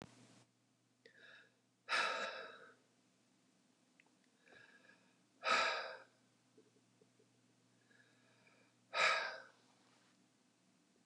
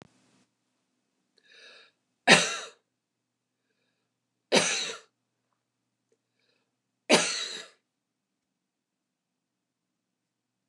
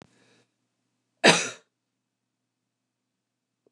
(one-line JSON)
{"exhalation_length": "11.1 s", "exhalation_amplitude": 2989, "exhalation_signal_mean_std_ratio": 0.31, "three_cough_length": "10.7 s", "three_cough_amplitude": 24700, "three_cough_signal_mean_std_ratio": 0.21, "cough_length": "3.7 s", "cough_amplitude": 25007, "cough_signal_mean_std_ratio": 0.17, "survey_phase": "beta (2021-08-13 to 2022-03-07)", "age": "45-64", "gender": "Female", "wearing_mask": "No", "symptom_none": true, "smoker_status": "Ex-smoker", "respiratory_condition_asthma": false, "respiratory_condition_other": false, "recruitment_source": "REACT", "submission_delay": "2 days", "covid_test_result": "Negative", "covid_test_method": "RT-qPCR", "influenza_a_test_result": "Negative", "influenza_b_test_result": "Negative"}